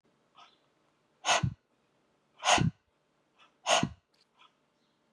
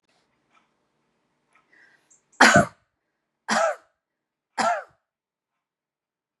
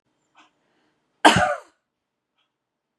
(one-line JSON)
{"exhalation_length": "5.1 s", "exhalation_amplitude": 9515, "exhalation_signal_mean_std_ratio": 0.3, "three_cough_length": "6.4 s", "three_cough_amplitude": 28262, "three_cough_signal_mean_std_ratio": 0.24, "cough_length": "3.0 s", "cough_amplitude": 31320, "cough_signal_mean_std_ratio": 0.23, "survey_phase": "beta (2021-08-13 to 2022-03-07)", "age": "45-64", "gender": "Female", "wearing_mask": "No", "symptom_none": true, "smoker_status": "Never smoked", "respiratory_condition_asthma": false, "respiratory_condition_other": false, "recruitment_source": "REACT", "submission_delay": "3 days", "covid_test_result": "Negative", "covid_test_method": "RT-qPCR", "influenza_a_test_result": "Unknown/Void", "influenza_b_test_result": "Unknown/Void"}